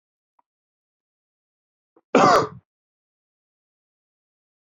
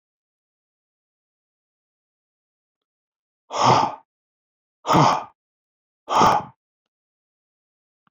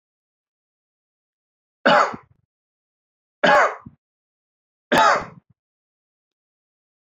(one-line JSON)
{"cough_length": "4.6 s", "cough_amplitude": 29193, "cough_signal_mean_std_ratio": 0.21, "exhalation_length": "8.1 s", "exhalation_amplitude": 22905, "exhalation_signal_mean_std_ratio": 0.28, "three_cough_length": "7.2 s", "three_cough_amplitude": 24846, "three_cough_signal_mean_std_ratio": 0.28, "survey_phase": "alpha (2021-03-01 to 2021-08-12)", "age": "45-64", "gender": "Male", "wearing_mask": "No", "symptom_none": true, "smoker_status": "Current smoker (e-cigarettes or vapes only)", "respiratory_condition_asthma": false, "respiratory_condition_other": false, "recruitment_source": "REACT", "submission_delay": "2 days", "covid_test_result": "Negative", "covid_test_method": "RT-qPCR"}